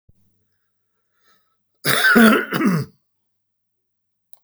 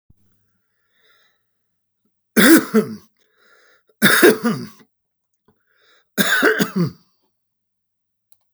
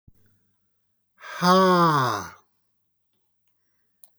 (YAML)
cough_length: 4.4 s
cough_amplitude: 32768
cough_signal_mean_std_ratio: 0.36
three_cough_length: 8.5 s
three_cough_amplitude: 32768
three_cough_signal_mean_std_ratio: 0.33
exhalation_length: 4.2 s
exhalation_amplitude: 16427
exhalation_signal_mean_std_ratio: 0.37
survey_phase: beta (2021-08-13 to 2022-03-07)
age: 65+
gender: Male
wearing_mask: 'No'
symptom_runny_or_blocked_nose: true
symptom_fatigue: true
symptom_onset: 12 days
smoker_status: Never smoked
respiratory_condition_asthma: false
respiratory_condition_other: false
recruitment_source: REACT
submission_delay: 3 days
covid_test_result: Negative
covid_test_method: RT-qPCR
influenza_a_test_result: Unknown/Void
influenza_b_test_result: Unknown/Void